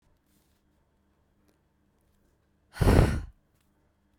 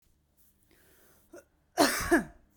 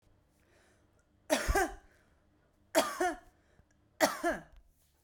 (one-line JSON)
{"exhalation_length": "4.2 s", "exhalation_amplitude": 17110, "exhalation_signal_mean_std_ratio": 0.24, "cough_length": "2.6 s", "cough_amplitude": 12189, "cough_signal_mean_std_ratio": 0.31, "three_cough_length": "5.0 s", "three_cough_amplitude": 9339, "three_cough_signal_mean_std_ratio": 0.36, "survey_phase": "beta (2021-08-13 to 2022-03-07)", "age": "18-44", "gender": "Female", "wearing_mask": "No", "symptom_none": true, "smoker_status": "Never smoked", "respiratory_condition_asthma": false, "respiratory_condition_other": false, "recruitment_source": "REACT", "submission_delay": "1 day", "covid_test_result": "Negative", "covid_test_method": "RT-qPCR", "influenza_a_test_result": "Negative", "influenza_b_test_result": "Negative"}